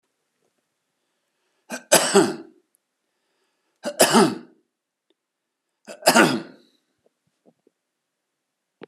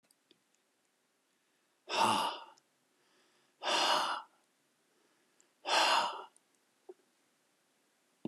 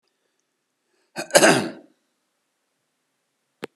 {
  "three_cough_length": "8.9 s",
  "three_cough_amplitude": 32020,
  "three_cough_signal_mean_std_ratio": 0.27,
  "exhalation_length": "8.3 s",
  "exhalation_amplitude": 5035,
  "exhalation_signal_mean_std_ratio": 0.36,
  "cough_length": "3.8 s",
  "cough_amplitude": 32767,
  "cough_signal_mean_std_ratio": 0.23,
  "survey_phase": "alpha (2021-03-01 to 2021-08-12)",
  "age": "65+",
  "gender": "Male",
  "wearing_mask": "No",
  "symptom_none": true,
  "smoker_status": "Never smoked",
  "respiratory_condition_asthma": false,
  "respiratory_condition_other": false,
  "recruitment_source": "REACT",
  "submission_delay": "31 days",
  "covid_test_result": "Negative",
  "covid_test_method": "RT-qPCR"
}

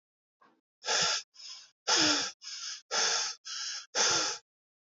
{
  "exhalation_length": "4.9 s",
  "exhalation_amplitude": 7354,
  "exhalation_signal_mean_std_ratio": 0.56,
  "survey_phase": "alpha (2021-03-01 to 2021-08-12)",
  "age": "18-44",
  "gender": "Male",
  "wearing_mask": "No",
  "symptom_change_to_sense_of_smell_or_taste": true,
  "symptom_loss_of_taste": true,
  "symptom_onset": "8 days",
  "smoker_status": "Current smoker (1 to 10 cigarettes per day)",
  "recruitment_source": "Test and Trace",
  "submission_delay": "6 days",
  "covid_test_result": "Positive",
  "covid_test_method": "RT-qPCR",
  "covid_ct_value": 33.2,
  "covid_ct_gene": "ORF1ab gene",
  "covid_ct_mean": 33.2,
  "covid_viral_load": "13 copies/ml",
  "covid_viral_load_category": "Minimal viral load (< 10K copies/ml)"
}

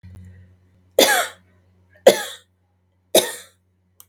{
  "three_cough_length": "4.1 s",
  "three_cough_amplitude": 32768,
  "three_cough_signal_mean_std_ratio": 0.28,
  "survey_phase": "beta (2021-08-13 to 2022-03-07)",
  "age": "45-64",
  "gender": "Female",
  "wearing_mask": "No",
  "symptom_none": true,
  "smoker_status": "Never smoked",
  "respiratory_condition_asthma": false,
  "respiratory_condition_other": false,
  "recruitment_source": "REACT",
  "submission_delay": "1 day",
  "covid_test_result": "Negative",
  "covid_test_method": "RT-qPCR",
  "influenza_a_test_result": "Negative",
  "influenza_b_test_result": "Negative"
}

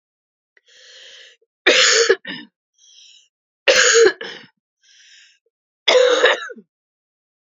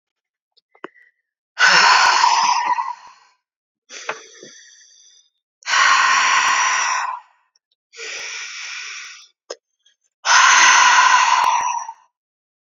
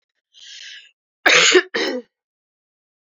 {
  "three_cough_length": "7.5 s",
  "three_cough_amplitude": 32768,
  "three_cough_signal_mean_std_ratio": 0.39,
  "exhalation_length": "12.8 s",
  "exhalation_amplitude": 32768,
  "exhalation_signal_mean_std_ratio": 0.53,
  "cough_length": "3.1 s",
  "cough_amplitude": 30052,
  "cough_signal_mean_std_ratio": 0.35,
  "survey_phase": "beta (2021-08-13 to 2022-03-07)",
  "age": "18-44",
  "gender": "Female",
  "wearing_mask": "No",
  "symptom_cough_any": true,
  "symptom_runny_or_blocked_nose": true,
  "smoker_status": "Never smoked",
  "respiratory_condition_asthma": true,
  "respiratory_condition_other": false,
  "recruitment_source": "Test and Trace",
  "submission_delay": "2 days",
  "covid_test_result": "Positive",
  "covid_test_method": "RT-qPCR",
  "covid_ct_value": 23.5,
  "covid_ct_gene": "ORF1ab gene"
}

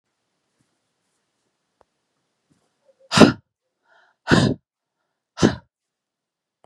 {
  "exhalation_length": "6.7 s",
  "exhalation_amplitude": 32768,
  "exhalation_signal_mean_std_ratio": 0.21,
  "survey_phase": "beta (2021-08-13 to 2022-03-07)",
  "age": "45-64",
  "gender": "Female",
  "wearing_mask": "No",
  "symptom_cough_any": true,
  "symptom_runny_or_blocked_nose": true,
  "symptom_other": true,
  "symptom_onset": "3 days",
  "smoker_status": "Never smoked",
  "respiratory_condition_asthma": false,
  "respiratory_condition_other": false,
  "recruitment_source": "Test and Trace",
  "submission_delay": "2 days",
  "covid_test_result": "Positive",
  "covid_test_method": "RT-qPCR",
  "covid_ct_value": 17.1,
  "covid_ct_gene": "ORF1ab gene",
  "covid_ct_mean": 17.5,
  "covid_viral_load": "1800000 copies/ml",
  "covid_viral_load_category": "High viral load (>1M copies/ml)"
}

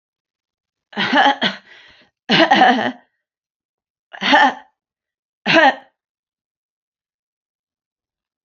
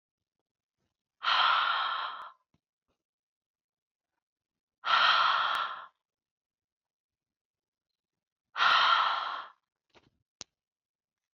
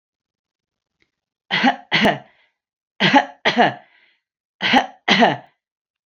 {
  "three_cough_length": "8.4 s",
  "three_cough_amplitude": 28810,
  "three_cough_signal_mean_std_ratio": 0.35,
  "exhalation_length": "11.3 s",
  "exhalation_amplitude": 8291,
  "exhalation_signal_mean_std_ratio": 0.39,
  "cough_length": "6.1 s",
  "cough_amplitude": 27561,
  "cough_signal_mean_std_ratio": 0.39,
  "survey_phase": "beta (2021-08-13 to 2022-03-07)",
  "age": "45-64",
  "gender": "Female",
  "wearing_mask": "No",
  "symptom_none": true,
  "smoker_status": "Never smoked",
  "respiratory_condition_asthma": false,
  "respiratory_condition_other": true,
  "recruitment_source": "REACT",
  "submission_delay": "2 days",
  "covid_test_result": "Positive",
  "covid_test_method": "RT-qPCR",
  "covid_ct_value": 27.0,
  "covid_ct_gene": "E gene",
  "influenza_a_test_result": "Negative",
  "influenza_b_test_result": "Negative"
}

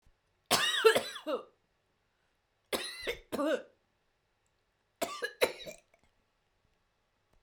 {
  "three_cough_length": "7.4 s",
  "three_cough_amplitude": 10658,
  "three_cough_signal_mean_std_ratio": 0.33,
  "survey_phase": "beta (2021-08-13 to 2022-03-07)",
  "age": "45-64",
  "gender": "Female",
  "wearing_mask": "No",
  "symptom_none": true,
  "smoker_status": "Never smoked",
  "respiratory_condition_asthma": true,
  "respiratory_condition_other": false,
  "recruitment_source": "REACT",
  "submission_delay": "-1 day",
  "covid_test_result": "Negative",
  "covid_test_method": "RT-qPCR",
  "influenza_a_test_result": "Negative",
  "influenza_b_test_result": "Negative"
}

